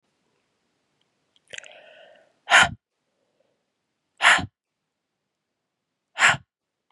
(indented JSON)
{
  "exhalation_length": "6.9 s",
  "exhalation_amplitude": 28084,
  "exhalation_signal_mean_std_ratio": 0.22,
  "survey_phase": "beta (2021-08-13 to 2022-03-07)",
  "age": "18-44",
  "gender": "Female",
  "wearing_mask": "No",
  "symptom_runny_or_blocked_nose": true,
  "symptom_fatigue": true,
  "symptom_change_to_sense_of_smell_or_taste": true,
  "symptom_onset": "5 days",
  "smoker_status": "Never smoked",
  "respiratory_condition_asthma": true,
  "respiratory_condition_other": false,
  "recruitment_source": "Test and Trace",
  "submission_delay": "2 days",
  "covid_test_result": "Positive",
  "covid_test_method": "RT-qPCR",
  "covid_ct_value": 16.4,
  "covid_ct_gene": "S gene",
  "covid_ct_mean": 18.8,
  "covid_viral_load": "660000 copies/ml",
  "covid_viral_load_category": "Low viral load (10K-1M copies/ml)"
}